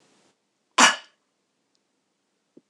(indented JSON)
{
  "cough_length": "2.7 s",
  "cough_amplitude": 26028,
  "cough_signal_mean_std_ratio": 0.19,
  "survey_phase": "beta (2021-08-13 to 2022-03-07)",
  "age": "45-64",
  "gender": "Female",
  "wearing_mask": "No",
  "symptom_none": true,
  "smoker_status": "Never smoked",
  "respiratory_condition_asthma": false,
  "respiratory_condition_other": false,
  "recruitment_source": "REACT",
  "submission_delay": "1 day",
  "covid_test_result": "Negative",
  "covid_test_method": "RT-qPCR",
  "influenza_a_test_result": "Negative",
  "influenza_b_test_result": "Negative"
}